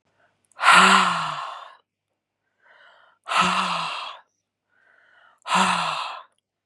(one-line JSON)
{"exhalation_length": "6.7 s", "exhalation_amplitude": 29275, "exhalation_signal_mean_std_ratio": 0.42, "survey_phase": "beta (2021-08-13 to 2022-03-07)", "age": "18-44", "gender": "Female", "wearing_mask": "No", "symptom_none": true, "smoker_status": "Ex-smoker", "respiratory_condition_asthma": false, "respiratory_condition_other": false, "recruitment_source": "REACT", "submission_delay": "1 day", "covid_test_result": "Negative", "covid_test_method": "RT-qPCR", "influenza_a_test_result": "Negative", "influenza_b_test_result": "Negative"}